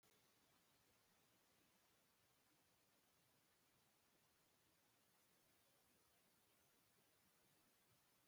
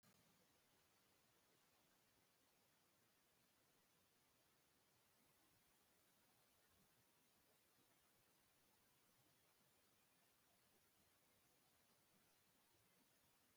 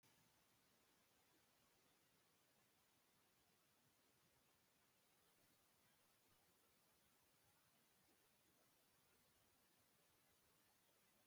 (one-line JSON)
{"cough_length": "8.3 s", "cough_amplitude": 29, "cough_signal_mean_std_ratio": 1.09, "exhalation_length": "13.6 s", "exhalation_amplitude": 22, "exhalation_signal_mean_std_ratio": 1.09, "three_cough_length": "11.3 s", "three_cough_amplitude": 22, "three_cough_signal_mean_std_ratio": 1.1, "survey_phase": "beta (2021-08-13 to 2022-03-07)", "age": "65+", "gender": "Male", "wearing_mask": "No", "symptom_none": true, "smoker_status": "Ex-smoker", "respiratory_condition_asthma": false, "respiratory_condition_other": false, "recruitment_source": "REACT", "submission_delay": "2 days", "covid_test_result": "Negative", "covid_test_method": "RT-qPCR", "influenza_a_test_result": "Negative", "influenza_b_test_result": "Negative"}